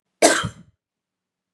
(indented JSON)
{
  "cough_length": "1.5 s",
  "cough_amplitude": 32767,
  "cough_signal_mean_std_ratio": 0.29,
  "survey_phase": "beta (2021-08-13 to 2022-03-07)",
  "age": "18-44",
  "gender": "Female",
  "wearing_mask": "No",
  "symptom_runny_or_blocked_nose": true,
  "symptom_fatigue": true,
  "smoker_status": "Never smoked",
  "respiratory_condition_asthma": false,
  "respiratory_condition_other": false,
  "recruitment_source": "Test and Trace",
  "submission_delay": "0 days",
  "covid_test_result": "Positive",
  "covid_test_method": "LFT"
}